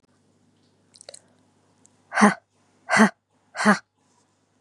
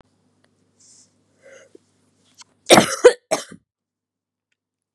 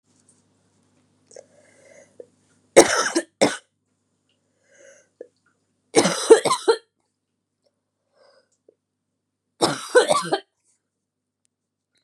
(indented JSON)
{
  "exhalation_length": "4.6 s",
  "exhalation_amplitude": 31794,
  "exhalation_signal_mean_std_ratio": 0.26,
  "cough_length": "4.9 s",
  "cough_amplitude": 32768,
  "cough_signal_mean_std_ratio": 0.2,
  "three_cough_length": "12.0 s",
  "three_cough_amplitude": 32768,
  "three_cough_signal_mean_std_ratio": 0.25,
  "survey_phase": "beta (2021-08-13 to 2022-03-07)",
  "age": "18-44",
  "gender": "Female",
  "wearing_mask": "No",
  "symptom_cough_any": true,
  "symptom_runny_or_blocked_nose": true,
  "symptom_onset": "13 days",
  "smoker_status": "Never smoked",
  "respiratory_condition_asthma": false,
  "respiratory_condition_other": false,
  "recruitment_source": "REACT",
  "submission_delay": "2 days",
  "covid_test_result": "Negative",
  "covid_test_method": "RT-qPCR",
  "influenza_a_test_result": "Negative",
  "influenza_b_test_result": "Negative"
}